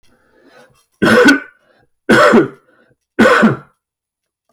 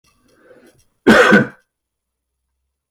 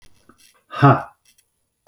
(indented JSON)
{
  "three_cough_length": "4.5 s",
  "three_cough_amplitude": 32768,
  "three_cough_signal_mean_std_ratio": 0.45,
  "cough_length": "2.9 s",
  "cough_amplitude": 29644,
  "cough_signal_mean_std_ratio": 0.31,
  "exhalation_length": "1.9 s",
  "exhalation_amplitude": 27791,
  "exhalation_signal_mean_std_ratio": 0.27,
  "survey_phase": "alpha (2021-03-01 to 2021-08-12)",
  "age": "45-64",
  "gender": "Male",
  "wearing_mask": "No",
  "symptom_none": true,
  "smoker_status": "Prefer not to say",
  "respiratory_condition_asthma": false,
  "respiratory_condition_other": false,
  "recruitment_source": "REACT",
  "submission_delay": "8 days",
  "covid_test_result": "Negative",
  "covid_test_method": "RT-qPCR"
}